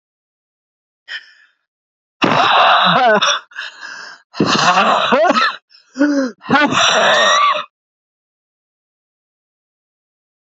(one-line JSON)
{"exhalation_length": "10.4 s", "exhalation_amplitude": 30556, "exhalation_signal_mean_std_ratio": 0.55, "survey_phase": "beta (2021-08-13 to 2022-03-07)", "age": "45-64", "gender": "Female", "wearing_mask": "No", "symptom_cough_any": true, "symptom_runny_or_blocked_nose": true, "symptom_sore_throat": true, "symptom_headache": true, "symptom_other": true, "smoker_status": "Never smoked", "respiratory_condition_asthma": false, "respiratory_condition_other": false, "recruitment_source": "Test and Trace", "submission_delay": "2 days", "covid_test_result": "Positive", "covid_test_method": "RT-qPCR", "covid_ct_value": 30.6, "covid_ct_gene": "ORF1ab gene"}